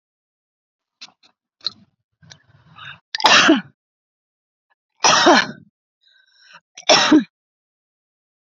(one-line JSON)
{"three_cough_length": "8.5 s", "three_cough_amplitude": 32768, "three_cough_signal_mean_std_ratio": 0.3, "survey_phase": "beta (2021-08-13 to 2022-03-07)", "age": "45-64", "gender": "Female", "wearing_mask": "No", "symptom_none": true, "symptom_onset": "2 days", "smoker_status": "Ex-smoker", "respiratory_condition_asthma": false, "respiratory_condition_other": false, "recruitment_source": "REACT", "submission_delay": "5 days", "covid_test_result": "Negative", "covid_test_method": "RT-qPCR"}